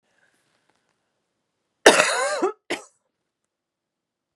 {"cough_length": "4.4 s", "cough_amplitude": 32768, "cough_signal_mean_std_ratio": 0.26, "survey_phase": "beta (2021-08-13 to 2022-03-07)", "age": "45-64", "gender": "Female", "wearing_mask": "No", "symptom_cough_any": true, "symptom_runny_or_blocked_nose": true, "symptom_fatigue": true, "symptom_headache": true, "symptom_onset": "4 days", "smoker_status": "Current smoker (e-cigarettes or vapes only)", "respiratory_condition_asthma": false, "respiratory_condition_other": false, "recruitment_source": "Test and Trace", "submission_delay": "1 day", "covid_test_result": "Positive", "covid_test_method": "RT-qPCR", "covid_ct_value": 27.7, "covid_ct_gene": "ORF1ab gene"}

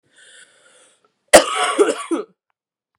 {"cough_length": "3.0 s", "cough_amplitude": 32768, "cough_signal_mean_std_ratio": 0.32, "survey_phase": "beta (2021-08-13 to 2022-03-07)", "age": "18-44", "gender": "Female", "wearing_mask": "No", "symptom_cough_any": true, "symptom_runny_or_blocked_nose": true, "symptom_shortness_of_breath": true, "symptom_sore_throat": true, "symptom_abdominal_pain": true, "symptom_fatigue": true, "symptom_fever_high_temperature": true, "symptom_headache": true, "symptom_change_to_sense_of_smell_or_taste": true, "symptom_loss_of_taste": true, "symptom_onset": "7 days", "smoker_status": "Never smoked", "respiratory_condition_asthma": false, "respiratory_condition_other": false, "recruitment_source": "Test and Trace", "submission_delay": "2 days", "covid_test_result": "Positive", "covid_test_method": "RT-qPCR", "covid_ct_value": 21.4, "covid_ct_gene": "ORF1ab gene"}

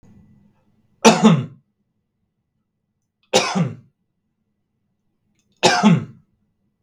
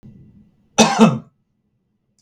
{"three_cough_length": "6.8 s", "three_cough_amplitude": 32768, "three_cough_signal_mean_std_ratio": 0.31, "cough_length": "2.2 s", "cough_amplitude": 32768, "cough_signal_mean_std_ratio": 0.32, "survey_phase": "beta (2021-08-13 to 2022-03-07)", "age": "45-64", "gender": "Male", "wearing_mask": "No", "symptom_none": true, "smoker_status": "Never smoked", "respiratory_condition_asthma": false, "respiratory_condition_other": false, "recruitment_source": "REACT", "submission_delay": "1 day", "covid_test_result": "Negative", "covid_test_method": "RT-qPCR", "influenza_a_test_result": "Negative", "influenza_b_test_result": "Negative"}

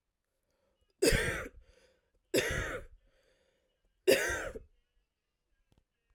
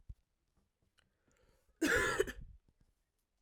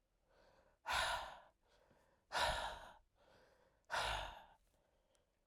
{"three_cough_length": "6.1 s", "three_cough_amplitude": 7493, "three_cough_signal_mean_std_ratio": 0.34, "cough_length": "3.4 s", "cough_amplitude": 3965, "cough_signal_mean_std_ratio": 0.32, "exhalation_length": "5.5 s", "exhalation_amplitude": 1846, "exhalation_signal_mean_std_ratio": 0.43, "survey_phase": "alpha (2021-03-01 to 2021-08-12)", "age": "18-44", "gender": "Female", "wearing_mask": "No", "symptom_cough_any": true, "symptom_fatigue": true, "symptom_change_to_sense_of_smell_or_taste": true, "symptom_loss_of_taste": true, "symptom_onset": "5 days", "smoker_status": "Never smoked", "respiratory_condition_asthma": false, "respiratory_condition_other": false, "recruitment_source": "Test and Trace", "submission_delay": "2 days", "covid_test_result": "Positive", "covid_test_method": "RT-qPCR"}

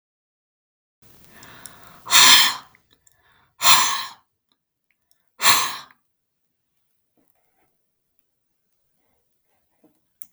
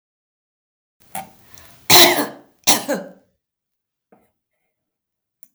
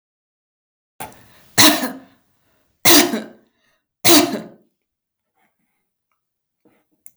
{"exhalation_length": "10.3 s", "exhalation_amplitude": 32768, "exhalation_signal_mean_std_ratio": 0.25, "cough_length": "5.5 s", "cough_amplitude": 32768, "cough_signal_mean_std_ratio": 0.26, "three_cough_length": "7.2 s", "three_cough_amplitude": 32768, "three_cough_signal_mean_std_ratio": 0.29, "survey_phase": "beta (2021-08-13 to 2022-03-07)", "age": "65+", "gender": "Female", "wearing_mask": "No", "symptom_none": true, "smoker_status": "Never smoked", "respiratory_condition_asthma": false, "respiratory_condition_other": false, "recruitment_source": "REACT", "submission_delay": "2 days", "covid_test_result": "Negative", "covid_test_method": "RT-qPCR", "influenza_a_test_result": "Negative", "influenza_b_test_result": "Negative"}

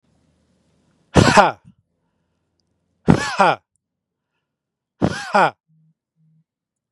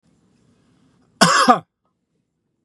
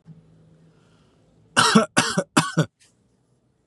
{"exhalation_length": "6.9 s", "exhalation_amplitude": 32768, "exhalation_signal_mean_std_ratio": 0.28, "cough_length": "2.6 s", "cough_amplitude": 32768, "cough_signal_mean_std_ratio": 0.29, "three_cough_length": "3.7 s", "three_cough_amplitude": 29133, "three_cough_signal_mean_std_ratio": 0.34, "survey_phase": "beta (2021-08-13 to 2022-03-07)", "age": "18-44", "gender": "Male", "wearing_mask": "No", "symptom_none": true, "smoker_status": "Never smoked", "respiratory_condition_asthma": false, "respiratory_condition_other": false, "recruitment_source": "REACT", "submission_delay": "1 day", "covid_test_result": "Negative", "covid_test_method": "RT-qPCR", "influenza_a_test_result": "Negative", "influenza_b_test_result": "Negative"}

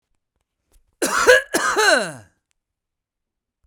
{"cough_length": "3.7 s", "cough_amplitude": 32768, "cough_signal_mean_std_ratio": 0.38, "survey_phase": "beta (2021-08-13 to 2022-03-07)", "age": "18-44", "gender": "Male", "wearing_mask": "No", "symptom_none": true, "smoker_status": "Ex-smoker", "respiratory_condition_asthma": true, "respiratory_condition_other": false, "recruitment_source": "REACT", "submission_delay": "4 days", "covid_test_result": "Negative", "covid_test_method": "RT-qPCR", "influenza_a_test_result": "Negative", "influenza_b_test_result": "Negative"}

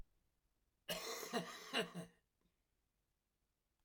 {"cough_length": "3.8 s", "cough_amplitude": 1794, "cough_signal_mean_std_ratio": 0.4, "survey_phase": "beta (2021-08-13 to 2022-03-07)", "age": "45-64", "gender": "Male", "wearing_mask": "No", "symptom_new_continuous_cough": true, "symptom_change_to_sense_of_smell_or_taste": true, "symptom_onset": "5 days", "smoker_status": "Never smoked", "respiratory_condition_asthma": true, "respiratory_condition_other": false, "recruitment_source": "Test and Trace", "submission_delay": "2 days", "covid_test_result": "Positive", "covid_test_method": "RT-qPCR", "covid_ct_value": 21.7, "covid_ct_gene": "ORF1ab gene", "covid_ct_mean": 22.5, "covid_viral_load": "43000 copies/ml", "covid_viral_load_category": "Low viral load (10K-1M copies/ml)"}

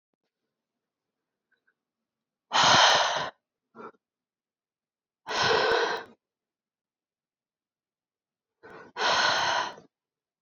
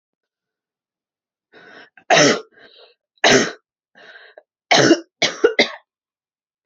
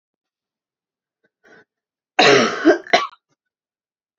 {"exhalation_length": "10.4 s", "exhalation_amplitude": 15846, "exhalation_signal_mean_std_ratio": 0.36, "three_cough_length": "6.7 s", "three_cough_amplitude": 32767, "three_cough_signal_mean_std_ratio": 0.32, "cough_length": "4.2 s", "cough_amplitude": 29970, "cough_signal_mean_std_ratio": 0.3, "survey_phase": "beta (2021-08-13 to 2022-03-07)", "age": "18-44", "gender": "Female", "wearing_mask": "No", "symptom_cough_any": true, "symptom_runny_or_blocked_nose": true, "symptom_sore_throat": true, "symptom_fatigue": true, "symptom_fever_high_temperature": true, "symptom_headache": true, "symptom_change_to_sense_of_smell_or_taste": true, "symptom_loss_of_taste": true, "symptom_onset": "3 days", "smoker_status": "Never smoked", "respiratory_condition_asthma": false, "respiratory_condition_other": false, "recruitment_source": "Test and Trace", "submission_delay": "2 days", "covid_test_result": "Positive", "covid_test_method": "RT-qPCR", "covid_ct_value": 22.1, "covid_ct_gene": "ORF1ab gene"}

